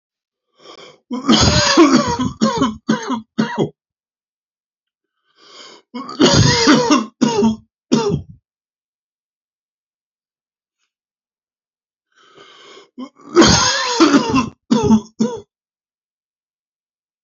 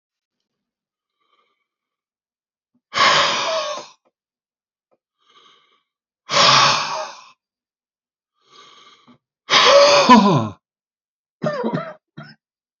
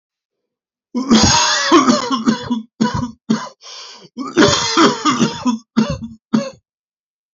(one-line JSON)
{"three_cough_length": "17.2 s", "three_cough_amplitude": 32767, "three_cough_signal_mean_std_ratio": 0.44, "exhalation_length": "12.8 s", "exhalation_amplitude": 29551, "exhalation_signal_mean_std_ratio": 0.36, "cough_length": "7.3 s", "cough_amplitude": 32487, "cough_signal_mean_std_ratio": 0.57, "survey_phase": "alpha (2021-03-01 to 2021-08-12)", "age": "45-64", "gender": "Male", "wearing_mask": "No", "symptom_none": true, "smoker_status": "Ex-smoker", "respiratory_condition_asthma": false, "respiratory_condition_other": false, "recruitment_source": "REACT", "submission_delay": "1 day", "covid_test_result": "Negative", "covid_test_method": "RT-qPCR"}